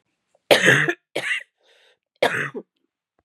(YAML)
three_cough_length: 3.2 s
three_cough_amplitude: 32297
three_cough_signal_mean_std_ratio: 0.38
survey_phase: beta (2021-08-13 to 2022-03-07)
age: 45-64
gender: Female
wearing_mask: 'No'
symptom_cough_any: true
symptom_runny_or_blocked_nose: true
symptom_sore_throat: true
symptom_abdominal_pain: true
symptom_fatigue: true
symptom_headache: true
symptom_onset: 3 days
smoker_status: Never smoked
respiratory_condition_asthma: true
respiratory_condition_other: false
recruitment_source: Test and Trace
submission_delay: 1 day
covid_test_result: Positive
covid_test_method: RT-qPCR
covid_ct_value: 17.1
covid_ct_gene: N gene
covid_ct_mean: 17.8
covid_viral_load: 1500000 copies/ml
covid_viral_load_category: High viral load (>1M copies/ml)